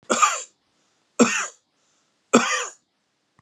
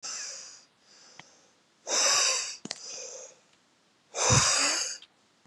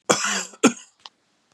{
  "three_cough_length": "3.4 s",
  "three_cough_amplitude": 31053,
  "three_cough_signal_mean_std_ratio": 0.36,
  "exhalation_length": "5.5 s",
  "exhalation_amplitude": 11879,
  "exhalation_signal_mean_std_ratio": 0.49,
  "cough_length": "1.5 s",
  "cough_amplitude": 32768,
  "cough_signal_mean_std_ratio": 0.38,
  "survey_phase": "beta (2021-08-13 to 2022-03-07)",
  "age": "45-64",
  "gender": "Male",
  "wearing_mask": "No",
  "symptom_none": true,
  "smoker_status": "Ex-smoker",
  "respiratory_condition_asthma": false,
  "respiratory_condition_other": false,
  "recruitment_source": "REACT",
  "submission_delay": "2 days",
  "covid_test_result": "Negative",
  "covid_test_method": "RT-qPCR",
  "influenza_a_test_result": "Negative",
  "influenza_b_test_result": "Negative"
}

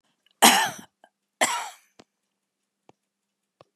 {
  "cough_length": "3.8 s",
  "cough_amplitude": 27240,
  "cough_signal_mean_std_ratio": 0.26,
  "survey_phase": "beta (2021-08-13 to 2022-03-07)",
  "age": "65+",
  "gender": "Female",
  "wearing_mask": "No",
  "symptom_none": true,
  "smoker_status": "Never smoked",
  "respiratory_condition_asthma": false,
  "respiratory_condition_other": false,
  "recruitment_source": "REACT",
  "submission_delay": "2 days",
  "covid_test_result": "Negative",
  "covid_test_method": "RT-qPCR",
  "influenza_a_test_result": "Negative",
  "influenza_b_test_result": "Negative"
}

